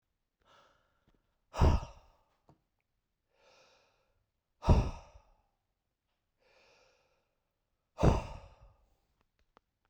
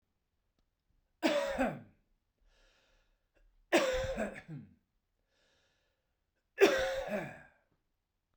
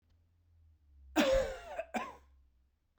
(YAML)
exhalation_length: 9.9 s
exhalation_amplitude: 7885
exhalation_signal_mean_std_ratio: 0.22
three_cough_length: 8.4 s
three_cough_amplitude: 7890
three_cough_signal_mean_std_ratio: 0.35
cough_length: 3.0 s
cough_amplitude: 4541
cough_signal_mean_std_ratio: 0.39
survey_phase: beta (2021-08-13 to 2022-03-07)
age: 65+
gender: Male
wearing_mask: 'No'
symptom_none: true
smoker_status: Ex-smoker
respiratory_condition_asthma: false
respiratory_condition_other: false
recruitment_source: REACT
submission_delay: 2 days
covid_test_result: Negative
covid_test_method: RT-qPCR
influenza_a_test_result: Negative
influenza_b_test_result: Negative